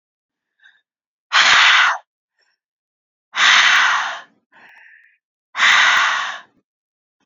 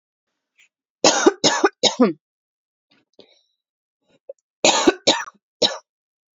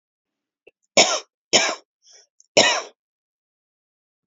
{"exhalation_length": "7.3 s", "exhalation_amplitude": 31505, "exhalation_signal_mean_std_ratio": 0.46, "cough_length": "6.4 s", "cough_amplitude": 28979, "cough_signal_mean_std_ratio": 0.33, "three_cough_length": "4.3 s", "three_cough_amplitude": 31594, "three_cough_signal_mean_std_ratio": 0.29, "survey_phase": "beta (2021-08-13 to 2022-03-07)", "age": "18-44", "gender": "Female", "wearing_mask": "No", "symptom_runny_or_blocked_nose": true, "symptom_sore_throat": true, "smoker_status": "Current smoker (1 to 10 cigarettes per day)", "respiratory_condition_asthma": false, "respiratory_condition_other": false, "recruitment_source": "Test and Trace", "submission_delay": "2 days", "covid_test_result": "Positive", "covid_test_method": "RT-qPCR", "covid_ct_value": 28.4, "covid_ct_gene": "N gene"}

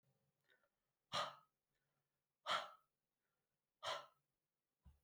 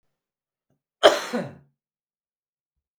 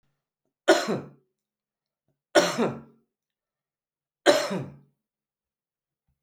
{"exhalation_length": "5.0 s", "exhalation_amplitude": 1034, "exhalation_signal_mean_std_ratio": 0.27, "cough_length": "3.0 s", "cough_amplitude": 32768, "cough_signal_mean_std_ratio": 0.21, "three_cough_length": "6.2 s", "three_cough_amplitude": 24520, "three_cough_signal_mean_std_ratio": 0.28, "survey_phase": "beta (2021-08-13 to 2022-03-07)", "age": "65+", "gender": "Male", "wearing_mask": "No", "symptom_cough_any": true, "symptom_runny_or_blocked_nose": true, "symptom_sore_throat": true, "symptom_onset": "2 days", "smoker_status": "Ex-smoker", "respiratory_condition_asthma": false, "respiratory_condition_other": false, "recruitment_source": "Test and Trace", "submission_delay": "1 day", "covid_test_result": "Negative", "covid_test_method": "RT-qPCR"}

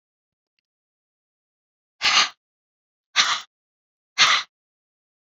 {"exhalation_length": "5.2 s", "exhalation_amplitude": 25209, "exhalation_signal_mean_std_ratio": 0.28, "survey_phase": "beta (2021-08-13 to 2022-03-07)", "age": "65+", "gender": "Female", "wearing_mask": "No", "symptom_none": true, "smoker_status": "Never smoked", "respiratory_condition_asthma": false, "respiratory_condition_other": false, "recruitment_source": "REACT", "submission_delay": "6 days", "covid_test_result": "Negative", "covid_test_method": "RT-qPCR"}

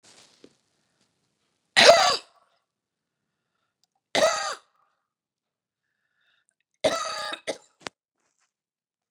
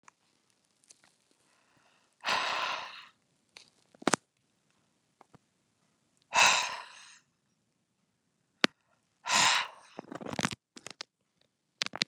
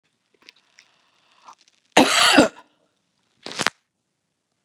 {"three_cough_length": "9.1 s", "three_cough_amplitude": 30028, "three_cough_signal_mean_std_ratio": 0.24, "exhalation_length": "12.1 s", "exhalation_amplitude": 26357, "exhalation_signal_mean_std_ratio": 0.26, "cough_length": "4.6 s", "cough_amplitude": 32767, "cough_signal_mean_std_ratio": 0.26, "survey_phase": "beta (2021-08-13 to 2022-03-07)", "age": "65+", "gender": "Female", "wearing_mask": "No", "symptom_fatigue": true, "symptom_onset": "12 days", "smoker_status": "Never smoked", "respiratory_condition_asthma": false, "respiratory_condition_other": false, "recruitment_source": "REACT", "submission_delay": "1 day", "covid_test_result": "Negative", "covid_test_method": "RT-qPCR", "influenza_a_test_result": "Negative", "influenza_b_test_result": "Negative"}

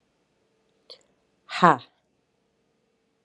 {"exhalation_length": "3.2 s", "exhalation_amplitude": 31173, "exhalation_signal_mean_std_ratio": 0.16, "survey_phase": "beta (2021-08-13 to 2022-03-07)", "age": "18-44", "gender": "Female", "wearing_mask": "No", "symptom_cough_any": true, "symptom_runny_or_blocked_nose": true, "symptom_shortness_of_breath": true, "symptom_sore_throat": true, "symptom_diarrhoea": true, "symptom_fatigue": true, "symptom_fever_high_temperature": true, "symptom_headache": true, "symptom_loss_of_taste": true, "symptom_onset": "5 days", "smoker_status": "Ex-smoker", "respiratory_condition_asthma": false, "respiratory_condition_other": false, "recruitment_source": "Test and Trace", "submission_delay": "2 days", "covid_test_result": "Positive", "covid_test_method": "RT-qPCR", "covid_ct_value": 15.2, "covid_ct_gene": "ORF1ab gene", "covid_ct_mean": 15.7, "covid_viral_load": "7000000 copies/ml", "covid_viral_load_category": "High viral load (>1M copies/ml)"}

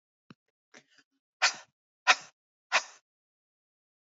{"exhalation_length": "4.1 s", "exhalation_amplitude": 15599, "exhalation_signal_mean_std_ratio": 0.19, "survey_phase": "alpha (2021-03-01 to 2021-08-12)", "age": "45-64", "gender": "Female", "wearing_mask": "No", "symptom_none": true, "smoker_status": "Never smoked", "respiratory_condition_asthma": false, "respiratory_condition_other": false, "recruitment_source": "Test and Trace", "submission_delay": "-1 day", "covid_test_result": "Negative", "covid_test_method": "LFT"}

